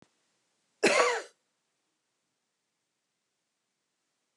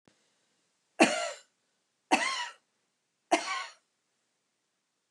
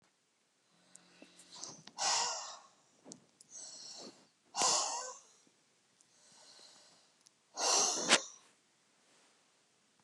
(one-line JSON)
{"cough_length": "4.4 s", "cough_amplitude": 11342, "cough_signal_mean_std_ratio": 0.23, "three_cough_length": "5.1 s", "three_cough_amplitude": 16181, "three_cough_signal_mean_std_ratio": 0.29, "exhalation_length": "10.0 s", "exhalation_amplitude": 12568, "exhalation_signal_mean_std_ratio": 0.35, "survey_phase": "beta (2021-08-13 to 2022-03-07)", "age": "65+", "gender": "Female", "wearing_mask": "No", "symptom_none": true, "smoker_status": "Ex-smoker", "respiratory_condition_asthma": true, "respiratory_condition_other": false, "recruitment_source": "REACT", "submission_delay": "3 days", "covid_test_result": "Negative", "covid_test_method": "RT-qPCR", "influenza_a_test_result": "Negative", "influenza_b_test_result": "Negative"}